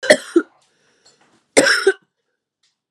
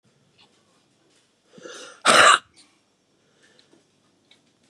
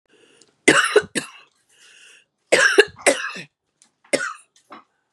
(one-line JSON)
{"cough_length": "2.9 s", "cough_amplitude": 32768, "cough_signal_mean_std_ratio": 0.32, "exhalation_length": "4.7 s", "exhalation_amplitude": 31882, "exhalation_signal_mean_std_ratio": 0.23, "three_cough_length": "5.1 s", "three_cough_amplitude": 32767, "three_cough_signal_mean_std_ratio": 0.34, "survey_phase": "beta (2021-08-13 to 2022-03-07)", "age": "45-64", "gender": "Female", "wearing_mask": "No", "symptom_cough_any": true, "symptom_runny_or_blocked_nose": true, "symptom_sore_throat": true, "symptom_fatigue": true, "symptom_headache": true, "symptom_change_to_sense_of_smell_or_taste": true, "smoker_status": "Never smoked", "respiratory_condition_asthma": false, "respiratory_condition_other": false, "recruitment_source": "Test and Trace", "submission_delay": "2 days", "covid_test_result": "Positive", "covid_test_method": "RT-qPCR", "covid_ct_value": 16.6, "covid_ct_gene": "ORF1ab gene", "covid_ct_mean": 16.9, "covid_viral_load": "2800000 copies/ml", "covid_viral_load_category": "High viral load (>1M copies/ml)"}